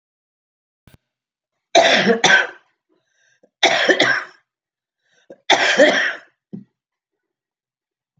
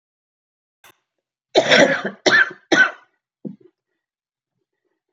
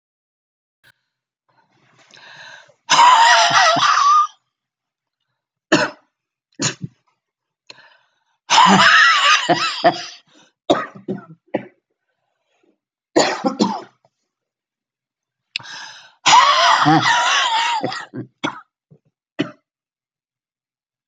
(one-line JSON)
{"three_cough_length": "8.2 s", "three_cough_amplitude": 31612, "three_cough_signal_mean_std_ratio": 0.38, "cough_length": "5.1 s", "cough_amplitude": 30593, "cough_signal_mean_std_ratio": 0.33, "exhalation_length": "21.1 s", "exhalation_amplitude": 32768, "exhalation_signal_mean_std_ratio": 0.43, "survey_phase": "beta (2021-08-13 to 2022-03-07)", "age": "65+", "gender": "Female", "wearing_mask": "No", "symptom_cough_any": true, "symptom_runny_or_blocked_nose": true, "symptom_fatigue": true, "symptom_other": true, "symptom_onset": "12 days", "smoker_status": "Never smoked", "respiratory_condition_asthma": false, "respiratory_condition_other": true, "recruitment_source": "REACT", "submission_delay": "2 days", "covid_test_result": "Negative", "covid_test_method": "RT-qPCR", "influenza_a_test_result": "Negative", "influenza_b_test_result": "Negative"}